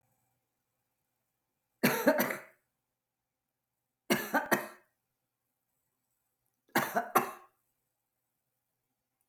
{"three_cough_length": "9.3 s", "three_cough_amplitude": 10671, "three_cough_signal_mean_std_ratio": 0.27, "survey_phase": "alpha (2021-03-01 to 2021-08-12)", "age": "45-64", "gender": "Female", "wearing_mask": "No", "symptom_fatigue": true, "smoker_status": "Never smoked", "respiratory_condition_asthma": false, "respiratory_condition_other": false, "recruitment_source": "REACT", "submission_delay": "2 days", "covid_test_result": "Negative", "covid_test_method": "RT-qPCR"}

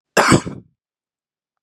{"cough_length": "1.6 s", "cough_amplitude": 32767, "cough_signal_mean_std_ratio": 0.32, "survey_phase": "beta (2021-08-13 to 2022-03-07)", "age": "18-44", "gender": "Male", "wearing_mask": "No", "symptom_none": true, "smoker_status": "Ex-smoker", "respiratory_condition_asthma": false, "respiratory_condition_other": false, "recruitment_source": "REACT", "submission_delay": "1 day", "covid_test_result": "Negative", "covid_test_method": "RT-qPCR"}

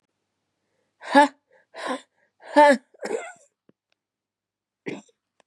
{"exhalation_length": "5.5 s", "exhalation_amplitude": 28128, "exhalation_signal_mean_std_ratio": 0.25, "survey_phase": "beta (2021-08-13 to 2022-03-07)", "age": "45-64", "gender": "Female", "wearing_mask": "No", "symptom_cough_any": true, "symptom_new_continuous_cough": true, "symptom_runny_or_blocked_nose": true, "symptom_sore_throat": true, "symptom_fatigue": true, "symptom_fever_high_temperature": true, "symptom_headache": true, "symptom_change_to_sense_of_smell_or_taste": true, "symptom_onset": "4 days", "smoker_status": "Ex-smoker", "respiratory_condition_asthma": false, "respiratory_condition_other": false, "recruitment_source": "Test and Trace", "submission_delay": "2 days", "covid_test_result": "Positive", "covid_test_method": "RT-qPCR", "covid_ct_value": 18.3, "covid_ct_gene": "N gene", "covid_ct_mean": 19.3, "covid_viral_load": "460000 copies/ml", "covid_viral_load_category": "Low viral load (10K-1M copies/ml)"}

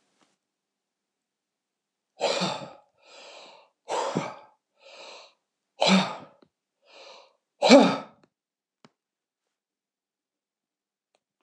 {"exhalation_length": "11.4 s", "exhalation_amplitude": 25140, "exhalation_signal_mean_std_ratio": 0.24, "survey_phase": "beta (2021-08-13 to 2022-03-07)", "age": "65+", "gender": "Male", "wearing_mask": "No", "symptom_none": true, "smoker_status": "Never smoked", "respiratory_condition_asthma": false, "respiratory_condition_other": false, "recruitment_source": "REACT", "submission_delay": "8 days", "covid_test_result": "Negative", "covid_test_method": "RT-qPCR", "influenza_a_test_result": "Negative", "influenza_b_test_result": "Negative"}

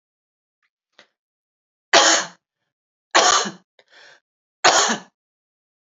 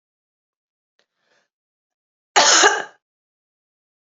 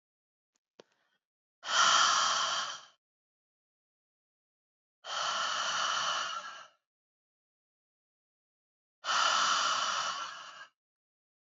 {"three_cough_length": "5.9 s", "three_cough_amplitude": 32021, "three_cough_signal_mean_std_ratio": 0.31, "cough_length": "4.2 s", "cough_amplitude": 31986, "cough_signal_mean_std_ratio": 0.26, "exhalation_length": "11.4 s", "exhalation_amplitude": 7522, "exhalation_signal_mean_std_ratio": 0.47, "survey_phase": "beta (2021-08-13 to 2022-03-07)", "age": "45-64", "gender": "Female", "wearing_mask": "No", "symptom_none": true, "smoker_status": "Never smoked", "respiratory_condition_asthma": false, "respiratory_condition_other": false, "recruitment_source": "REACT", "submission_delay": "1 day", "covid_test_result": "Negative", "covid_test_method": "RT-qPCR", "influenza_a_test_result": "Negative", "influenza_b_test_result": "Negative"}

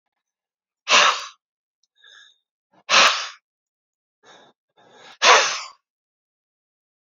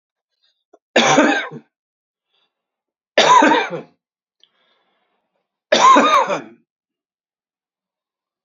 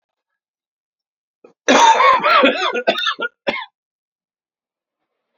{"exhalation_length": "7.2 s", "exhalation_amplitude": 28758, "exhalation_signal_mean_std_ratio": 0.29, "three_cough_length": "8.4 s", "three_cough_amplitude": 29693, "three_cough_signal_mean_std_ratio": 0.36, "cough_length": "5.4 s", "cough_amplitude": 31368, "cough_signal_mean_std_ratio": 0.42, "survey_phase": "beta (2021-08-13 to 2022-03-07)", "age": "65+", "gender": "Male", "wearing_mask": "No", "symptom_cough_any": true, "symptom_sore_throat": true, "symptom_fatigue": true, "symptom_headache": true, "smoker_status": "Never smoked", "respiratory_condition_asthma": false, "respiratory_condition_other": false, "recruitment_source": "Test and Trace", "submission_delay": "1 day", "covid_test_result": "Positive", "covid_test_method": "RT-qPCR", "covid_ct_value": 26.8, "covid_ct_gene": "ORF1ab gene", "covid_ct_mean": 27.2, "covid_viral_load": "1200 copies/ml", "covid_viral_load_category": "Minimal viral load (< 10K copies/ml)"}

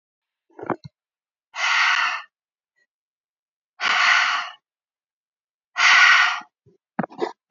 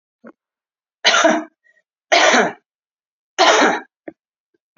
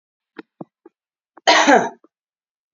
{"exhalation_length": "7.5 s", "exhalation_amplitude": 26036, "exhalation_signal_mean_std_ratio": 0.42, "three_cough_length": "4.8 s", "three_cough_amplitude": 30178, "three_cough_signal_mean_std_ratio": 0.41, "cough_length": "2.7 s", "cough_amplitude": 28954, "cough_signal_mean_std_ratio": 0.31, "survey_phase": "beta (2021-08-13 to 2022-03-07)", "age": "45-64", "gender": "Female", "wearing_mask": "No", "symptom_cough_any": true, "symptom_shortness_of_breath": true, "symptom_sore_throat": true, "symptom_change_to_sense_of_smell_or_taste": true, "symptom_other": true, "symptom_onset": "5 days", "smoker_status": "Never smoked", "respiratory_condition_asthma": false, "respiratory_condition_other": false, "recruitment_source": "Test and Trace", "submission_delay": "2 days", "covid_test_result": "Positive", "covid_test_method": "RT-qPCR", "covid_ct_value": 19.8, "covid_ct_gene": "ORF1ab gene"}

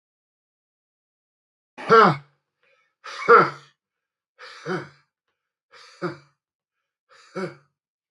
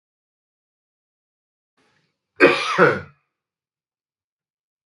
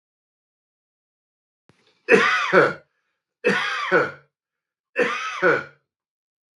{"exhalation_length": "8.1 s", "exhalation_amplitude": 23670, "exhalation_signal_mean_std_ratio": 0.23, "cough_length": "4.9 s", "cough_amplitude": 32766, "cough_signal_mean_std_ratio": 0.24, "three_cough_length": "6.6 s", "three_cough_amplitude": 27060, "three_cough_signal_mean_std_ratio": 0.4, "survey_phase": "beta (2021-08-13 to 2022-03-07)", "age": "65+", "gender": "Male", "wearing_mask": "No", "symptom_none": true, "smoker_status": "Ex-smoker", "respiratory_condition_asthma": false, "respiratory_condition_other": false, "recruitment_source": "REACT", "submission_delay": "1 day", "covid_test_result": "Negative", "covid_test_method": "RT-qPCR", "influenza_a_test_result": "Negative", "influenza_b_test_result": "Negative"}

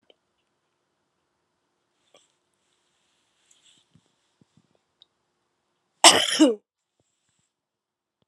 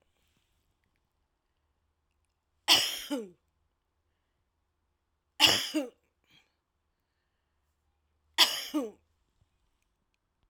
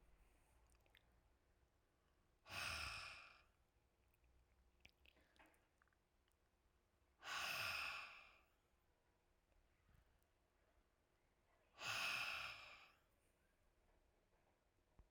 {"cough_length": "8.3 s", "cough_amplitude": 32767, "cough_signal_mean_std_ratio": 0.16, "three_cough_length": "10.5 s", "three_cough_amplitude": 15080, "three_cough_signal_mean_std_ratio": 0.23, "exhalation_length": "15.1 s", "exhalation_amplitude": 677, "exhalation_signal_mean_std_ratio": 0.38, "survey_phase": "alpha (2021-03-01 to 2021-08-12)", "age": "45-64", "gender": "Female", "wearing_mask": "No", "symptom_none": true, "smoker_status": "Ex-smoker", "respiratory_condition_asthma": false, "respiratory_condition_other": false, "recruitment_source": "REACT", "submission_delay": "2 days", "covid_test_result": "Negative", "covid_test_method": "RT-qPCR"}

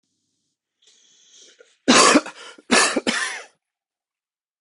{"three_cough_length": "4.6 s", "three_cough_amplitude": 28293, "three_cough_signal_mean_std_ratio": 0.34, "survey_phase": "beta (2021-08-13 to 2022-03-07)", "age": "45-64", "gender": "Male", "wearing_mask": "No", "symptom_cough_any": true, "symptom_runny_or_blocked_nose": true, "symptom_fatigue": true, "symptom_headache": true, "symptom_change_to_sense_of_smell_or_taste": true, "smoker_status": "Never smoked", "respiratory_condition_asthma": false, "respiratory_condition_other": false, "recruitment_source": "Test and Trace", "submission_delay": "2 days", "covid_test_result": "Positive", "covid_test_method": "RT-qPCR", "covid_ct_value": 26.2, "covid_ct_gene": "ORF1ab gene"}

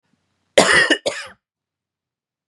{"cough_length": "2.5 s", "cough_amplitude": 32768, "cough_signal_mean_std_ratio": 0.34, "survey_phase": "beta (2021-08-13 to 2022-03-07)", "age": "18-44", "gender": "Male", "wearing_mask": "No", "symptom_cough_any": true, "symptom_onset": "12 days", "smoker_status": "Never smoked", "respiratory_condition_asthma": false, "respiratory_condition_other": false, "recruitment_source": "REACT", "submission_delay": "1 day", "covid_test_result": "Negative", "covid_test_method": "RT-qPCR", "influenza_a_test_result": "Negative", "influenza_b_test_result": "Negative"}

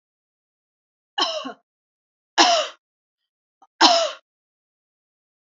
{"three_cough_length": "5.5 s", "three_cough_amplitude": 32768, "three_cough_signal_mean_std_ratio": 0.29, "survey_phase": "alpha (2021-03-01 to 2021-08-12)", "age": "65+", "gender": "Female", "wearing_mask": "No", "symptom_none": true, "smoker_status": "Never smoked", "respiratory_condition_asthma": false, "respiratory_condition_other": false, "recruitment_source": "REACT", "submission_delay": "1 day", "covid_test_result": "Negative", "covid_test_method": "RT-qPCR"}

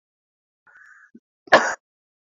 {"cough_length": "2.4 s", "cough_amplitude": 28483, "cough_signal_mean_std_ratio": 0.2, "survey_phase": "beta (2021-08-13 to 2022-03-07)", "age": "45-64", "gender": "Male", "wearing_mask": "No", "symptom_cough_any": true, "symptom_shortness_of_breath": true, "symptom_sore_throat": true, "symptom_fatigue": true, "symptom_fever_high_temperature": true, "symptom_change_to_sense_of_smell_or_taste": true, "symptom_onset": "6 days", "smoker_status": "Ex-smoker", "respiratory_condition_asthma": false, "respiratory_condition_other": false, "recruitment_source": "Test and Trace", "submission_delay": "2 days", "covid_test_result": "Positive", "covid_test_method": "RT-qPCR", "covid_ct_value": 20.7, "covid_ct_gene": "ORF1ab gene", "covid_ct_mean": 21.2, "covid_viral_load": "110000 copies/ml", "covid_viral_load_category": "Low viral load (10K-1M copies/ml)"}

